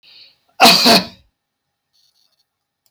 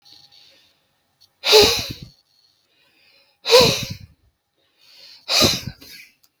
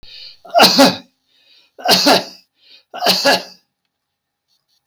{"cough_length": "2.9 s", "cough_amplitude": 32768, "cough_signal_mean_std_ratio": 0.32, "exhalation_length": "6.4 s", "exhalation_amplitude": 32766, "exhalation_signal_mean_std_ratio": 0.33, "three_cough_length": "4.9 s", "three_cough_amplitude": 32768, "three_cough_signal_mean_std_ratio": 0.42, "survey_phase": "beta (2021-08-13 to 2022-03-07)", "age": "65+", "gender": "Male", "wearing_mask": "No", "symptom_none": true, "smoker_status": "Ex-smoker", "respiratory_condition_asthma": false, "respiratory_condition_other": false, "recruitment_source": "REACT", "submission_delay": "2 days", "covid_test_result": "Negative", "covid_test_method": "RT-qPCR", "influenza_a_test_result": "Negative", "influenza_b_test_result": "Negative"}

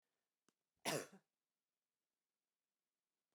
{"cough_length": "3.3 s", "cough_amplitude": 1349, "cough_signal_mean_std_ratio": 0.19, "survey_phase": "beta (2021-08-13 to 2022-03-07)", "age": "45-64", "gender": "Female", "wearing_mask": "No", "symptom_none": true, "smoker_status": "Never smoked", "respiratory_condition_asthma": false, "respiratory_condition_other": false, "recruitment_source": "REACT", "submission_delay": "2 days", "covid_test_result": "Negative", "covid_test_method": "RT-qPCR"}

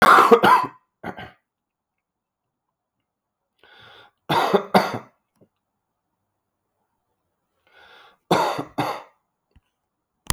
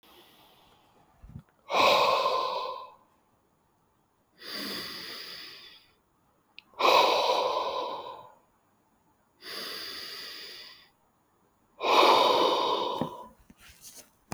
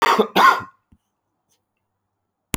{"three_cough_length": "10.3 s", "three_cough_amplitude": 32768, "three_cough_signal_mean_std_ratio": 0.29, "exhalation_length": "14.3 s", "exhalation_amplitude": 12317, "exhalation_signal_mean_std_ratio": 0.45, "cough_length": "2.6 s", "cough_amplitude": 29407, "cough_signal_mean_std_ratio": 0.34, "survey_phase": "alpha (2021-03-01 to 2021-08-12)", "age": "45-64", "gender": "Male", "wearing_mask": "No", "symptom_new_continuous_cough": true, "symptom_fatigue": true, "symptom_fever_high_temperature": true, "symptom_headache": true, "symptom_onset": "4 days", "smoker_status": "Ex-smoker", "respiratory_condition_asthma": true, "respiratory_condition_other": false, "recruitment_source": "Test and Trace", "submission_delay": "2 days", "covid_test_result": "Positive", "covid_test_method": "RT-qPCR", "covid_ct_value": 15.2, "covid_ct_gene": "ORF1ab gene", "covid_ct_mean": 15.5, "covid_viral_load": "8400000 copies/ml", "covid_viral_load_category": "High viral load (>1M copies/ml)"}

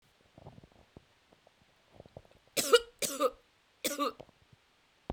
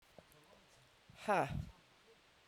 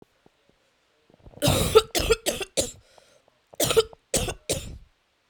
{"three_cough_length": "5.1 s", "three_cough_amplitude": 11223, "three_cough_signal_mean_std_ratio": 0.27, "exhalation_length": "2.5 s", "exhalation_amplitude": 2481, "exhalation_signal_mean_std_ratio": 0.34, "cough_length": "5.3 s", "cough_amplitude": 24339, "cough_signal_mean_std_ratio": 0.38, "survey_phase": "beta (2021-08-13 to 2022-03-07)", "age": "18-44", "gender": "Female", "wearing_mask": "No", "symptom_cough_any": true, "symptom_new_continuous_cough": true, "symptom_sore_throat": true, "symptom_diarrhoea": true, "symptom_fatigue": true, "symptom_headache": true, "symptom_other": true, "symptom_onset": "2 days", "smoker_status": "Never smoked", "respiratory_condition_asthma": false, "respiratory_condition_other": false, "recruitment_source": "Test and Trace", "submission_delay": "2 days", "covid_test_result": "Positive", "covid_test_method": "RT-qPCR", "covid_ct_value": 14.8, "covid_ct_gene": "ORF1ab gene", "covid_ct_mean": 16.3, "covid_viral_load": "4700000 copies/ml", "covid_viral_load_category": "High viral load (>1M copies/ml)"}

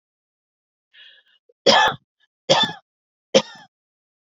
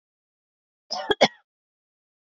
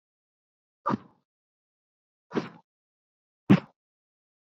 {"three_cough_length": "4.3 s", "three_cough_amplitude": 31584, "three_cough_signal_mean_std_ratio": 0.28, "cough_length": "2.2 s", "cough_amplitude": 25086, "cough_signal_mean_std_ratio": 0.21, "exhalation_length": "4.4 s", "exhalation_amplitude": 16989, "exhalation_signal_mean_std_ratio": 0.17, "survey_phase": "beta (2021-08-13 to 2022-03-07)", "age": "18-44", "gender": "Female", "wearing_mask": "No", "symptom_none": true, "smoker_status": "Never smoked", "respiratory_condition_asthma": true, "respiratory_condition_other": false, "recruitment_source": "REACT", "submission_delay": "1 day", "covid_test_result": "Negative", "covid_test_method": "RT-qPCR"}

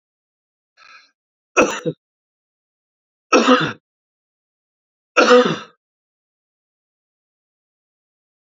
{"three_cough_length": "8.4 s", "three_cough_amplitude": 32767, "three_cough_signal_mean_std_ratio": 0.26, "survey_phase": "beta (2021-08-13 to 2022-03-07)", "age": "45-64", "gender": "Male", "wearing_mask": "No", "symptom_none": true, "smoker_status": "Never smoked", "respiratory_condition_asthma": false, "respiratory_condition_other": false, "recruitment_source": "REACT", "submission_delay": "2 days", "covid_test_result": "Negative", "covid_test_method": "RT-qPCR", "influenza_a_test_result": "Negative", "influenza_b_test_result": "Negative"}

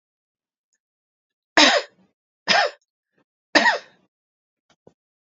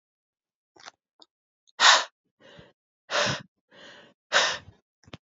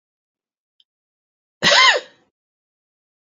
{"three_cough_length": "5.3 s", "three_cough_amplitude": 28273, "three_cough_signal_mean_std_ratio": 0.27, "exhalation_length": "5.4 s", "exhalation_amplitude": 21343, "exhalation_signal_mean_std_ratio": 0.28, "cough_length": "3.3 s", "cough_amplitude": 31197, "cough_signal_mean_std_ratio": 0.26, "survey_phase": "beta (2021-08-13 to 2022-03-07)", "age": "18-44", "gender": "Female", "wearing_mask": "No", "symptom_runny_or_blocked_nose": true, "symptom_onset": "3 days", "smoker_status": "Never smoked", "respiratory_condition_asthma": false, "respiratory_condition_other": false, "recruitment_source": "Test and Trace", "submission_delay": "2 days", "covid_test_result": "Positive", "covid_test_method": "RT-qPCR", "covid_ct_value": 19.3, "covid_ct_gene": "ORF1ab gene"}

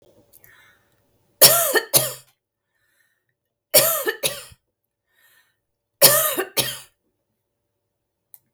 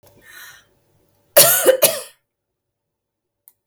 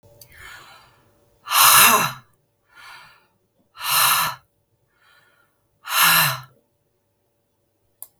{"three_cough_length": "8.5 s", "three_cough_amplitude": 32768, "three_cough_signal_mean_std_ratio": 0.3, "cough_length": "3.7 s", "cough_amplitude": 32768, "cough_signal_mean_std_ratio": 0.3, "exhalation_length": "8.2 s", "exhalation_amplitude": 32768, "exhalation_signal_mean_std_ratio": 0.35, "survey_phase": "beta (2021-08-13 to 2022-03-07)", "age": "45-64", "gender": "Female", "wearing_mask": "No", "symptom_none": true, "smoker_status": "Never smoked", "respiratory_condition_asthma": false, "respiratory_condition_other": false, "recruitment_source": "REACT", "submission_delay": "2 days", "covid_test_result": "Negative", "covid_test_method": "RT-qPCR", "influenza_a_test_result": "Negative", "influenza_b_test_result": "Negative"}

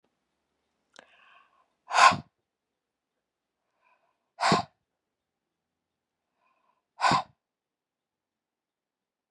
{"exhalation_length": "9.3 s", "exhalation_amplitude": 20568, "exhalation_signal_mean_std_ratio": 0.2, "survey_phase": "beta (2021-08-13 to 2022-03-07)", "age": "45-64", "gender": "Female", "wearing_mask": "No", "symptom_none": true, "smoker_status": "Never smoked", "respiratory_condition_asthma": false, "respiratory_condition_other": false, "recruitment_source": "REACT", "submission_delay": "2 days", "covid_test_result": "Negative", "covid_test_method": "RT-qPCR"}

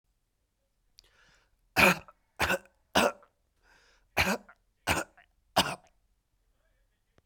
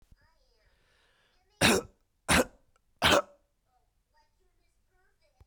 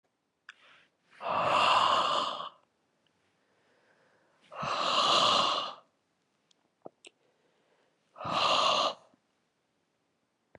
{"cough_length": "7.3 s", "cough_amplitude": 13912, "cough_signal_mean_std_ratio": 0.28, "three_cough_length": "5.5 s", "three_cough_amplitude": 14244, "three_cough_signal_mean_std_ratio": 0.26, "exhalation_length": "10.6 s", "exhalation_amplitude": 7287, "exhalation_signal_mean_std_ratio": 0.45, "survey_phase": "beta (2021-08-13 to 2022-03-07)", "age": "18-44", "gender": "Male", "wearing_mask": "No", "symptom_sore_throat": true, "symptom_onset": "12 days", "smoker_status": "Never smoked", "respiratory_condition_asthma": false, "respiratory_condition_other": false, "recruitment_source": "REACT", "submission_delay": "0 days", "covid_test_result": "Negative", "covid_test_method": "RT-qPCR", "influenza_a_test_result": "Negative", "influenza_b_test_result": "Negative"}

